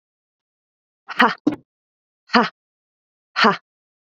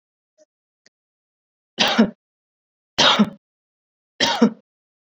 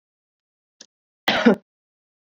exhalation_length: 4.1 s
exhalation_amplitude: 27645
exhalation_signal_mean_std_ratio: 0.26
three_cough_length: 5.1 s
three_cough_amplitude: 26405
three_cough_signal_mean_std_ratio: 0.31
cough_length: 2.3 s
cough_amplitude: 25349
cough_signal_mean_std_ratio: 0.25
survey_phase: beta (2021-08-13 to 2022-03-07)
age: 18-44
gender: Female
wearing_mask: 'No'
symptom_none: true
smoker_status: Never smoked
respiratory_condition_asthma: false
respiratory_condition_other: false
recruitment_source: REACT
submission_delay: 2 days
covid_test_result: Negative
covid_test_method: RT-qPCR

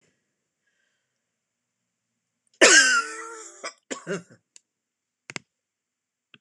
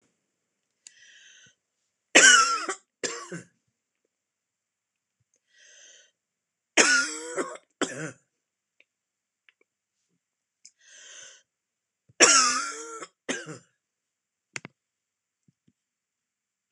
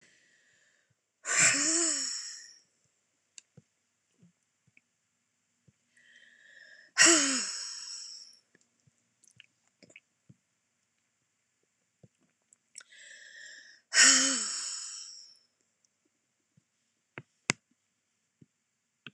cough_length: 6.4 s
cough_amplitude: 26028
cough_signal_mean_std_ratio: 0.24
three_cough_length: 16.7 s
three_cough_amplitude: 26028
three_cough_signal_mean_std_ratio: 0.25
exhalation_length: 19.1 s
exhalation_amplitude: 20391
exhalation_signal_mean_std_ratio: 0.27
survey_phase: beta (2021-08-13 to 2022-03-07)
age: 65+
gender: Female
wearing_mask: 'No'
symptom_none: true
smoker_status: Never smoked
respiratory_condition_asthma: false
respiratory_condition_other: false
recruitment_source: REACT
submission_delay: 2 days
covid_test_result: Negative
covid_test_method: RT-qPCR
influenza_a_test_result: Negative
influenza_b_test_result: Negative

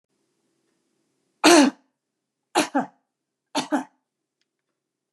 three_cough_length: 5.1 s
three_cough_amplitude: 27997
three_cough_signal_mean_std_ratio: 0.26
survey_phase: beta (2021-08-13 to 2022-03-07)
age: 65+
gender: Female
wearing_mask: 'No'
symptom_none: true
smoker_status: Never smoked
respiratory_condition_asthma: false
respiratory_condition_other: true
recruitment_source: REACT
submission_delay: 1 day
covid_test_result: Negative
covid_test_method: RT-qPCR
influenza_a_test_result: Negative
influenza_b_test_result: Negative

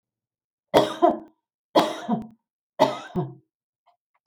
three_cough_length: 4.3 s
three_cough_amplitude: 24376
three_cough_signal_mean_std_ratio: 0.35
survey_phase: beta (2021-08-13 to 2022-03-07)
age: 65+
gender: Female
wearing_mask: 'No'
symptom_none: true
smoker_status: Never smoked
respiratory_condition_asthma: false
respiratory_condition_other: false
recruitment_source: REACT
submission_delay: 1 day
covid_test_result: Negative
covid_test_method: RT-qPCR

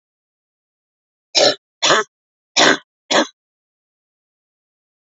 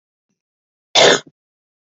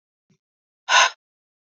three_cough_length: 5.0 s
three_cough_amplitude: 31854
three_cough_signal_mean_std_ratio: 0.3
cough_length: 1.9 s
cough_amplitude: 31023
cough_signal_mean_std_ratio: 0.28
exhalation_length: 1.8 s
exhalation_amplitude: 24140
exhalation_signal_mean_std_ratio: 0.26
survey_phase: beta (2021-08-13 to 2022-03-07)
age: 45-64
gender: Female
wearing_mask: 'No'
symptom_cough_any: true
smoker_status: Never smoked
respiratory_condition_asthma: false
respiratory_condition_other: false
recruitment_source: REACT
submission_delay: 2 days
covid_test_result: Negative
covid_test_method: RT-qPCR
influenza_a_test_result: Negative
influenza_b_test_result: Negative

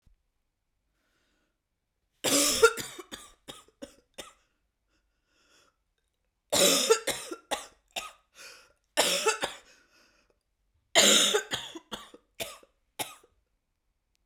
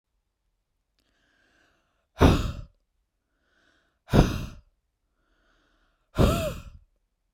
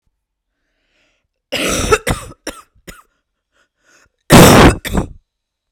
three_cough_length: 14.3 s
three_cough_amplitude: 20210
three_cough_signal_mean_std_ratio: 0.32
exhalation_length: 7.3 s
exhalation_amplitude: 27145
exhalation_signal_mean_std_ratio: 0.27
cough_length: 5.7 s
cough_amplitude: 32768
cough_signal_mean_std_ratio: 0.33
survey_phase: beta (2021-08-13 to 2022-03-07)
age: 18-44
gender: Female
wearing_mask: 'No'
symptom_cough_any: true
symptom_runny_or_blocked_nose: true
symptom_sore_throat: true
symptom_fatigue: true
symptom_onset: 3 days
smoker_status: Never smoked
respiratory_condition_asthma: false
respiratory_condition_other: false
recruitment_source: REACT
submission_delay: 0 days
covid_test_result: Negative
covid_test_method: RT-qPCR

